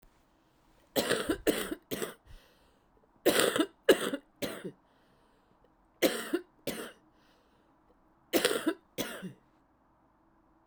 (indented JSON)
{
  "cough_length": "10.7 s",
  "cough_amplitude": 13261,
  "cough_signal_mean_std_ratio": 0.36,
  "survey_phase": "beta (2021-08-13 to 2022-03-07)",
  "age": "18-44",
  "gender": "Female",
  "wearing_mask": "No",
  "symptom_cough_any": true,
  "symptom_shortness_of_breath": true,
  "symptom_fatigue": true,
  "symptom_headache": true,
  "symptom_loss_of_taste": true,
  "symptom_onset": "10 days",
  "smoker_status": "Ex-smoker",
  "respiratory_condition_asthma": false,
  "respiratory_condition_other": false,
  "recruitment_source": "Test and Trace",
  "submission_delay": "3 days",
  "covid_test_result": "Positive",
  "covid_test_method": "RT-qPCR"
}